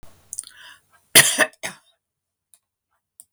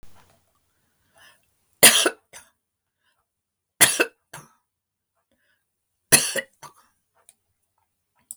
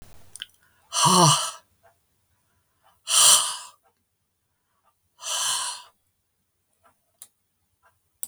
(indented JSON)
{
  "cough_length": "3.3 s",
  "cough_amplitude": 32768,
  "cough_signal_mean_std_ratio": 0.23,
  "three_cough_length": "8.4 s",
  "three_cough_amplitude": 32768,
  "three_cough_signal_mean_std_ratio": 0.21,
  "exhalation_length": "8.3 s",
  "exhalation_amplitude": 27343,
  "exhalation_signal_mean_std_ratio": 0.32,
  "survey_phase": "beta (2021-08-13 to 2022-03-07)",
  "age": "65+",
  "gender": "Female",
  "wearing_mask": "No",
  "symptom_none": true,
  "smoker_status": "Never smoked",
  "respiratory_condition_asthma": false,
  "respiratory_condition_other": false,
  "recruitment_source": "REACT",
  "submission_delay": "10 days",
  "covid_test_result": "Negative",
  "covid_test_method": "RT-qPCR"
}